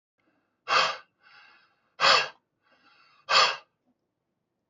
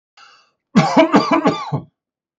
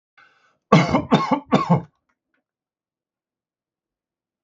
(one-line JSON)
{"exhalation_length": "4.7 s", "exhalation_amplitude": 17261, "exhalation_signal_mean_std_ratio": 0.32, "cough_length": "2.4 s", "cough_amplitude": 31852, "cough_signal_mean_std_ratio": 0.48, "three_cough_length": "4.4 s", "three_cough_amplitude": 29875, "three_cough_signal_mean_std_ratio": 0.32, "survey_phase": "beta (2021-08-13 to 2022-03-07)", "age": "45-64", "gender": "Male", "wearing_mask": "No", "symptom_none": true, "smoker_status": "Ex-smoker", "respiratory_condition_asthma": false, "respiratory_condition_other": false, "recruitment_source": "REACT", "submission_delay": "6 days", "covid_test_result": "Negative", "covid_test_method": "RT-qPCR", "influenza_a_test_result": "Negative", "influenza_b_test_result": "Negative"}